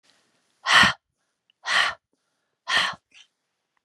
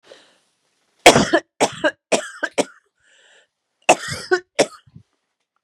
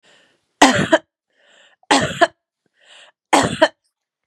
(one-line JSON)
{"exhalation_length": "3.8 s", "exhalation_amplitude": 24446, "exhalation_signal_mean_std_ratio": 0.33, "cough_length": "5.6 s", "cough_amplitude": 32768, "cough_signal_mean_std_ratio": 0.3, "three_cough_length": "4.3 s", "three_cough_amplitude": 32768, "three_cough_signal_mean_std_ratio": 0.33, "survey_phase": "beta (2021-08-13 to 2022-03-07)", "age": "45-64", "gender": "Female", "wearing_mask": "No", "symptom_new_continuous_cough": true, "symptom_runny_or_blocked_nose": true, "smoker_status": "Never smoked", "respiratory_condition_asthma": false, "respiratory_condition_other": false, "recruitment_source": "REACT", "submission_delay": "2 days", "covid_test_result": "Negative", "covid_test_method": "RT-qPCR", "influenza_a_test_result": "Negative", "influenza_b_test_result": "Negative"}